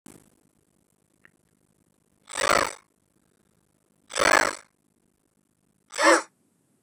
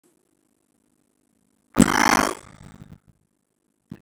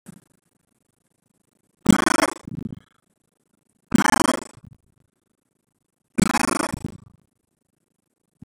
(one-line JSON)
{"exhalation_length": "6.8 s", "exhalation_amplitude": 19759, "exhalation_signal_mean_std_ratio": 0.24, "cough_length": "4.0 s", "cough_amplitude": 32768, "cough_signal_mean_std_ratio": 0.22, "three_cough_length": "8.4 s", "three_cough_amplitude": 32768, "three_cough_signal_mean_std_ratio": 0.25, "survey_phase": "beta (2021-08-13 to 2022-03-07)", "age": "18-44", "gender": "Male", "wearing_mask": "No", "symptom_fatigue": true, "smoker_status": "Current smoker (e-cigarettes or vapes only)", "respiratory_condition_asthma": false, "respiratory_condition_other": false, "recruitment_source": "REACT", "submission_delay": "1 day", "covid_test_result": "Negative", "covid_test_method": "RT-qPCR"}